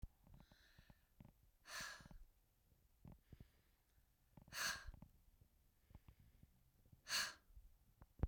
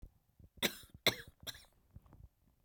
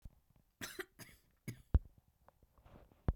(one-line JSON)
{"exhalation_length": "8.3 s", "exhalation_amplitude": 1272, "exhalation_signal_mean_std_ratio": 0.35, "three_cough_length": "2.6 s", "three_cough_amplitude": 5875, "three_cough_signal_mean_std_ratio": 0.25, "cough_length": "3.2 s", "cough_amplitude": 3866, "cough_signal_mean_std_ratio": 0.2, "survey_phase": "beta (2021-08-13 to 2022-03-07)", "age": "45-64", "gender": "Female", "wearing_mask": "No", "symptom_none": true, "smoker_status": "Never smoked", "respiratory_condition_asthma": false, "respiratory_condition_other": false, "recruitment_source": "Test and Trace", "submission_delay": "2 days", "covid_test_result": "Negative", "covid_test_method": "RT-qPCR"}